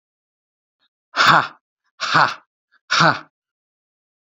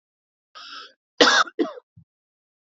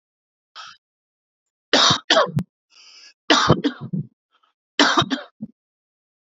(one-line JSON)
{"exhalation_length": "4.3 s", "exhalation_amplitude": 28548, "exhalation_signal_mean_std_ratio": 0.33, "cough_length": "2.7 s", "cough_amplitude": 27744, "cough_signal_mean_std_ratio": 0.29, "three_cough_length": "6.3 s", "three_cough_amplitude": 30204, "three_cough_signal_mean_std_ratio": 0.36, "survey_phase": "alpha (2021-03-01 to 2021-08-12)", "age": "18-44", "gender": "Male", "wearing_mask": "No", "symptom_none": true, "smoker_status": "Never smoked", "respiratory_condition_asthma": false, "respiratory_condition_other": false, "recruitment_source": "REACT", "submission_delay": "1 day", "covid_test_result": "Negative", "covid_test_method": "RT-qPCR"}